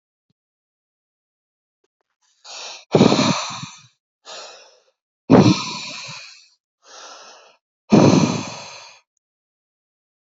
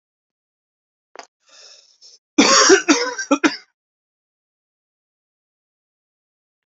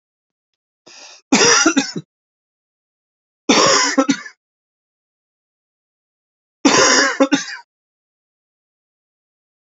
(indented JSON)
{
  "exhalation_length": "10.2 s",
  "exhalation_amplitude": 32716,
  "exhalation_signal_mean_std_ratio": 0.31,
  "cough_length": "6.7 s",
  "cough_amplitude": 32002,
  "cough_signal_mean_std_ratio": 0.27,
  "three_cough_length": "9.7 s",
  "three_cough_amplitude": 31981,
  "three_cough_signal_mean_std_ratio": 0.35,
  "survey_phase": "alpha (2021-03-01 to 2021-08-12)",
  "age": "45-64",
  "gender": "Male",
  "wearing_mask": "No",
  "symptom_cough_any": true,
  "symptom_abdominal_pain": true,
  "symptom_diarrhoea": true,
  "symptom_fatigue": true,
  "symptom_fever_high_temperature": true,
  "symptom_headache": true,
  "symptom_change_to_sense_of_smell_or_taste": true,
  "symptom_loss_of_taste": true,
  "symptom_onset": "3 days",
  "smoker_status": "Prefer not to say",
  "respiratory_condition_asthma": false,
  "respiratory_condition_other": false,
  "recruitment_source": "Test and Trace",
  "submission_delay": "2 days",
  "covid_test_result": "Positive",
  "covid_test_method": "RT-qPCR",
  "covid_ct_value": 16.8,
  "covid_ct_gene": "ORF1ab gene",
  "covid_ct_mean": 16.9,
  "covid_viral_load": "2900000 copies/ml",
  "covid_viral_load_category": "High viral load (>1M copies/ml)"
}